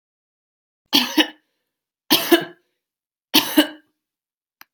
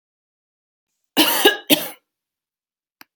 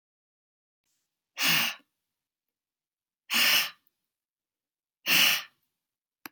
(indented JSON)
{
  "three_cough_length": "4.7 s",
  "three_cough_amplitude": 32767,
  "three_cough_signal_mean_std_ratio": 0.3,
  "cough_length": "3.2 s",
  "cough_amplitude": 32768,
  "cough_signal_mean_std_ratio": 0.3,
  "exhalation_length": "6.3 s",
  "exhalation_amplitude": 11010,
  "exhalation_signal_mean_std_ratio": 0.33,
  "survey_phase": "beta (2021-08-13 to 2022-03-07)",
  "age": "45-64",
  "gender": "Female",
  "wearing_mask": "No",
  "symptom_none": true,
  "smoker_status": "Never smoked",
  "respiratory_condition_asthma": false,
  "respiratory_condition_other": false,
  "recruitment_source": "Test and Trace",
  "submission_delay": "0 days",
  "covid_test_result": "Negative",
  "covid_test_method": "LFT"
}